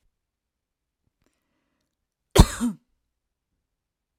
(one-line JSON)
{"cough_length": "4.2 s", "cough_amplitude": 32767, "cough_signal_mean_std_ratio": 0.15, "survey_phase": "alpha (2021-03-01 to 2021-08-12)", "age": "45-64", "gender": "Female", "wearing_mask": "No", "symptom_none": true, "smoker_status": "Never smoked", "respiratory_condition_asthma": false, "respiratory_condition_other": false, "recruitment_source": "REACT", "submission_delay": "2 days", "covid_test_result": "Negative", "covid_test_method": "RT-qPCR"}